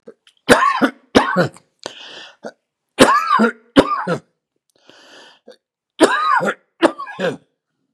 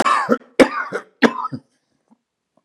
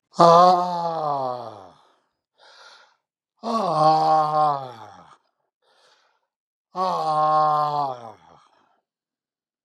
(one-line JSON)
{"three_cough_length": "7.9 s", "three_cough_amplitude": 32768, "three_cough_signal_mean_std_ratio": 0.43, "cough_length": "2.6 s", "cough_amplitude": 32768, "cough_signal_mean_std_ratio": 0.38, "exhalation_length": "9.6 s", "exhalation_amplitude": 30186, "exhalation_signal_mean_std_ratio": 0.47, "survey_phase": "beta (2021-08-13 to 2022-03-07)", "age": "65+", "gender": "Male", "wearing_mask": "No", "symptom_none": true, "smoker_status": "Ex-smoker", "respiratory_condition_asthma": false, "respiratory_condition_other": false, "recruitment_source": "REACT", "submission_delay": "2 days", "covid_test_result": "Negative", "covid_test_method": "RT-qPCR"}